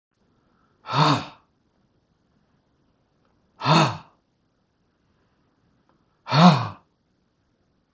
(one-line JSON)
{"exhalation_length": "7.9 s", "exhalation_amplitude": 32379, "exhalation_signal_mean_std_ratio": 0.26, "survey_phase": "beta (2021-08-13 to 2022-03-07)", "age": "65+", "gender": "Male", "wearing_mask": "No", "symptom_none": true, "smoker_status": "Never smoked", "respiratory_condition_asthma": false, "respiratory_condition_other": false, "recruitment_source": "REACT", "submission_delay": "3 days", "covid_test_result": "Negative", "covid_test_method": "RT-qPCR"}